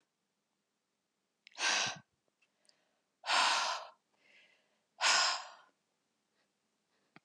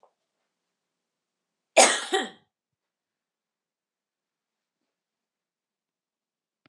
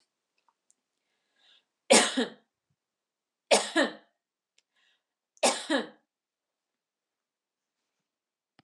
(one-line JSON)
{"exhalation_length": "7.2 s", "exhalation_amplitude": 5447, "exhalation_signal_mean_std_ratio": 0.34, "cough_length": "6.7 s", "cough_amplitude": 26888, "cough_signal_mean_std_ratio": 0.16, "three_cough_length": "8.6 s", "three_cough_amplitude": 17529, "three_cough_signal_mean_std_ratio": 0.24, "survey_phase": "beta (2021-08-13 to 2022-03-07)", "age": "45-64", "gender": "Female", "wearing_mask": "No", "symptom_none": true, "smoker_status": "Never smoked", "respiratory_condition_asthma": false, "respiratory_condition_other": false, "recruitment_source": "Test and Trace", "submission_delay": "1 day", "covid_test_result": "Negative", "covid_test_method": "LAMP"}